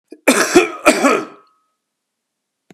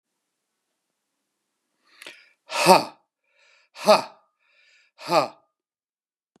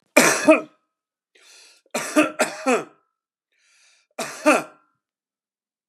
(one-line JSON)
{"cough_length": "2.7 s", "cough_amplitude": 32768, "cough_signal_mean_std_ratio": 0.41, "exhalation_length": "6.4 s", "exhalation_amplitude": 32248, "exhalation_signal_mean_std_ratio": 0.23, "three_cough_length": "5.9 s", "three_cough_amplitude": 32768, "three_cough_signal_mean_std_ratio": 0.33, "survey_phase": "beta (2021-08-13 to 2022-03-07)", "age": "65+", "gender": "Male", "wearing_mask": "No", "symptom_none": true, "smoker_status": "Ex-smoker", "respiratory_condition_asthma": false, "respiratory_condition_other": false, "recruitment_source": "REACT", "submission_delay": "1 day", "covid_test_result": "Negative", "covid_test_method": "RT-qPCR", "influenza_a_test_result": "Negative", "influenza_b_test_result": "Negative"}